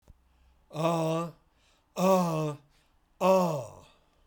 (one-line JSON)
{"exhalation_length": "4.3 s", "exhalation_amplitude": 7824, "exhalation_signal_mean_std_ratio": 0.52, "survey_phase": "beta (2021-08-13 to 2022-03-07)", "age": "65+", "gender": "Male", "wearing_mask": "No", "symptom_none": true, "smoker_status": "Ex-smoker", "respiratory_condition_asthma": false, "respiratory_condition_other": false, "recruitment_source": "REACT", "submission_delay": "3 days", "covid_test_result": "Negative", "covid_test_method": "RT-qPCR", "influenza_a_test_result": "Negative", "influenza_b_test_result": "Negative"}